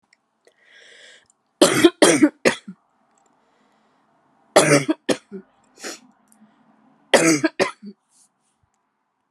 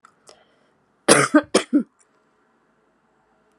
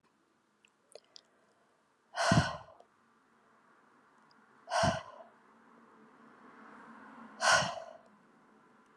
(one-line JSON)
{"three_cough_length": "9.3 s", "three_cough_amplitude": 32531, "three_cough_signal_mean_std_ratio": 0.3, "cough_length": "3.6 s", "cough_amplitude": 32768, "cough_signal_mean_std_ratio": 0.27, "exhalation_length": "9.0 s", "exhalation_amplitude": 7784, "exhalation_signal_mean_std_ratio": 0.3, "survey_phase": "alpha (2021-03-01 to 2021-08-12)", "age": "18-44", "gender": "Female", "wearing_mask": "No", "symptom_cough_any": true, "symptom_fatigue": true, "symptom_fever_high_temperature": true, "symptom_headache": true, "symptom_change_to_sense_of_smell_or_taste": true, "symptom_onset": "4 days", "smoker_status": "Never smoked", "respiratory_condition_asthma": false, "respiratory_condition_other": false, "recruitment_source": "Test and Trace", "submission_delay": "2 days", "covid_test_result": "Positive", "covid_test_method": "RT-qPCR", "covid_ct_value": 21.5, "covid_ct_gene": "N gene", "covid_ct_mean": 21.6, "covid_viral_load": "81000 copies/ml", "covid_viral_load_category": "Low viral load (10K-1M copies/ml)"}